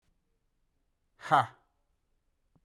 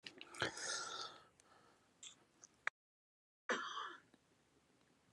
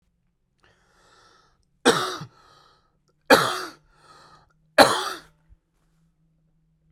{"exhalation_length": "2.6 s", "exhalation_amplitude": 9581, "exhalation_signal_mean_std_ratio": 0.19, "cough_length": "5.1 s", "cough_amplitude": 3335, "cough_signal_mean_std_ratio": 0.4, "three_cough_length": "6.9 s", "three_cough_amplitude": 32768, "three_cough_signal_mean_std_ratio": 0.24, "survey_phase": "alpha (2021-03-01 to 2021-08-12)", "age": "18-44", "gender": "Male", "wearing_mask": "No", "symptom_cough_any": true, "symptom_fatigue": true, "symptom_fever_high_temperature": true, "symptom_headache": true, "symptom_change_to_sense_of_smell_or_taste": true, "symptom_loss_of_taste": true, "symptom_onset": "3 days", "smoker_status": "Current smoker (1 to 10 cigarettes per day)", "respiratory_condition_asthma": false, "respiratory_condition_other": false, "recruitment_source": "Test and Trace", "submission_delay": "2 days", "covid_test_result": "Positive", "covid_test_method": "RT-qPCR", "covid_ct_value": 21.0, "covid_ct_gene": "ORF1ab gene"}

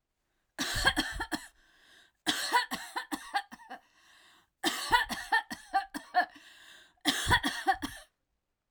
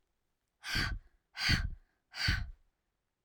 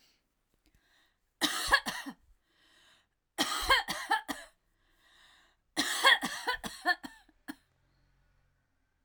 {"cough_length": "8.7 s", "cough_amplitude": 9455, "cough_signal_mean_std_ratio": 0.46, "exhalation_length": "3.2 s", "exhalation_amplitude": 4570, "exhalation_signal_mean_std_ratio": 0.45, "three_cough_length": "9.0 s", "three_cough_amplitude": 10324, "three_cough_signal_mean_std_ratio": 0.35, "survey_phase": "alpha (2021-03-01 to 2021-08-12)", "age": "45-64", "gender": "Female", "wearing_mask": "No", "symptom_none": true, "smoker_status": "Never smoked", "respiratory_condition_asthma": false, "respiratory_condition_other": false, "recruitment_source": "REACT", "submission_delay": "2 days", "covid_test_result": "Negative", "covid_test_method": "RT-qPCR"}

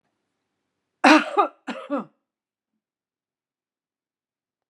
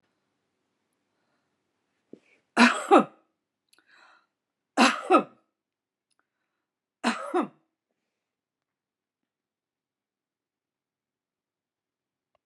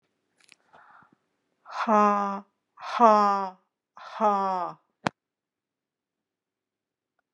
{"cough_length": "4.7 s", "cough_amplitude": 31072, "cough_signal_mean_std_ratio": 0.23, "three_cough_length": "12.5 s", "three_cough_amplitude": 22229, "three_cough_signal_mean_std_ratio": 0.2, "exhalation_length": "7.3 s", "exhalation_amplitude": 18982, "exhalation_signal_mean_std_ratio": 0.34, "survey_phase": "beta (2021-08-13 to 2022-03-07)", "age": "65+", "gender": "Female", "wearing_mask": "No", "symptom_fatigue": true, "symptom_headache": true, "symptom_onset": "8 days", "smoker_status": "Ex-smoker", "respiratory_condition_asthma": false, "respiratory_condition_other": false, "recruitment_source": "REACT", "submission_delay": "6 days", "covid_test_result": "Negative", "covid_test_method": "RT-qPCR"}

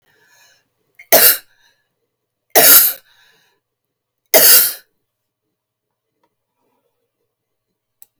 {"three_cough_length": "8.2 s", "three_cough_amplitude": 32768, "three_cough_signal_mean_std_ratio": 0.28, "survey_phase": "beta (2021-08-13 to 2022-03-07)", "age": "65+", "gender": "Female", "wearing_mask": "No", "symptom_cough_any": true, "symptom_runny_or_blocked_nose": true, "symptom_headache": true, "symptom_onset": "12 days", "smoker_status": "Never smoked", "respiratory_condition_asthma": false, "respiratory_condition_other": false, "recruitment_source": "REACT", "submission_delay": "2 days", "covid_test_result": "Negative", "covid_test_method": "RT-qPCR"}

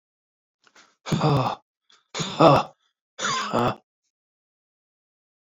{"exhalation_length": "5.5 s", "exhalation_amplitude": 26669, "exhalation_signal_mean_std_ratio": 0.36, "survey_phase": "alpha (2021-03-01 to 2021-08-12)", "age": "45-64", "gender": "Male", "wearing_mask": "No", "symptom_new_continuous_cough": true, "symptom_fatigue": true, "symptom_headache": true, "smoker_status": "Never smoked", "respiratory_condition_asthma": false, "respiratory_condition_other": false, "recruitment_source": "Test and Trace", "submission_delay": "2 days", "covid_test_result": "Positive", "covid_test_method": "RT-qPCR", "covid_ct_value": 24.8, "covid_ct_gene": "ORF1ab gene", "covid_ct_mean": 25.0, "covid_viral_load": "6500 copies/ml", "covid_viral_load_category": "Minimal viral load (< 10K copies/ml)"}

